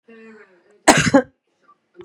{
  "cough_length": "2.0 s",
  "cough_amplitude": 32768,
  "cough_signal_mean_std_ratio": 0.3,
  "survey_phase": "beta (2021-08-13 to 2022-03-07)",
  "age": "45-64",
  "gender": "Female",
  "wearing_mask": "No",
  "symptom_none": true,
  "smoker_status": "Never smoked",
  "respiratory_condition_asthma": false,
  "respiratory_condition_other": false,
  "recruitment_source": "REACT",
  "submission_delay": "1 day",
  "covid_test_result": "Negative",
  "covid_test_method": "RT-qPCR",
  "influenza_a_test_result": "Negative",
  "influenza_b_test_result": "Negative"
}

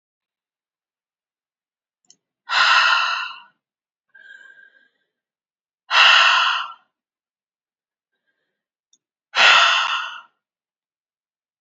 {
  "exhalation_length": "11.6 s",
  "exhalation_amplitude": 30002,
  "exhalation_signal_mean_std_ratio": 0.34,
  "survey_phase": "alpha (2021-03-01 to 2021-08-12)",
  "age": "45-64",
  "gender": "Female",
  "wearing_mask": "No",
  "symptom_cough_any": true,
  "symptom_headache": true,
  "symptom_onset": "3 days",
  "smoker_status": "Never smoked",
  "respiratory_condition_asthma": false,
  "respiratory_condition_other": false,
  "recruitment_source": "Test and Trace",
  "submission_delay": "1 day",
  "covid_test_result": "Positive",
  "covid_test_method": "RT-qPCR",
  "covid_ct_value": 17.5,
  "covid_ct_gene": "ORF1ab gene",
  "covid_ct_mean": 18.1,
  "covid_viral_load": "1100000 copies/ml",
  "covid_viral_load_category": "High viral load (>1M copies/ml)"
}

